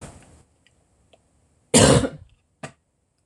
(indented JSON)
{
  "cough_length": "3.3 s",
  "cough_amplitude": 26027,
  "cough_signal_mean_std_ratio": 0.27,
  "survey_phase": "beta (2021-08-13 to 2022-03-07)",
  "age": "65+",
  "gender": "Female",
  "wearing_mask": "No",
  "symptom_cough_any": true,
  "symptom_fatigue": true,
  "symptom_onset": "12 days",
  "smoker_status": "Never smoked",
  "respiratory_condition_asthma": true,
  "respiratory_condition_other": false,
  "recruitment_source": "REACT",
  "submission_delay": "2 days",
  "covid_test_result": "Negative",
  "covid_test_method": "RT-qPCR",
  "influenza_a_test_result": "Negative",
  "influenza_b_test_result": "Negative"
}